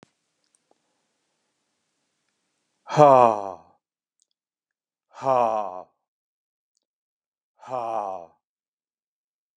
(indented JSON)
{
  "exhalation_length": "9.6 s",
  "exhalation_amplitude": 29403,
  "exhalation_signal_mean_std_ratio": 0.23,
  "survey_phase": "alpha (2021-03-01 to 2021-08-12)",
  "age": "65+",
  "gender": "Male",
  "wearing_mask": "No",
  "symptom_none": true,
  "smoker_status": "Ex-smoker",
  "respiratory_condition_asthma": false,
  "respiratory_condition_other": false,
  "recruitment_source": "REACT",
  "submission_delay": "3 days",
  "covid_test_result": "Negative",
  "covid_test_method": "RT-qPCR"
}